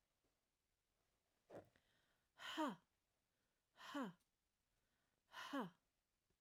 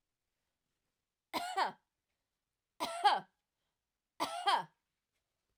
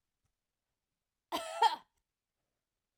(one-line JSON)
{"exhalation_length": "6.4 s", "exhalation_amplitude": 730, "exhalation_signal_mean_std_ratio": 0.3, "three_cough_length": "5.6 s", "three_cough_amplitude": 5209, "three_cough_signal_mean_std_ratio": 0.32, "cough_length": "3.0 s", "cough_amplitude": 4598, "cough_signal_mean_std_ratio": 0.23, "survey_phase": "alpha (2021-03-01 to 2021-08-12)", "age": "45-64", "gender": "Female", "wearing_mask": "No", "symptom_none": true, "smoker_status": "Never smoked", "respiratory_condition_asthma": false, "respiratory_condition_other": false, "recruitment_source": "REACT", "submission_delay": "2 days", "covid_test_result": "Negative", "covid_test_method": "RT-qPCR"}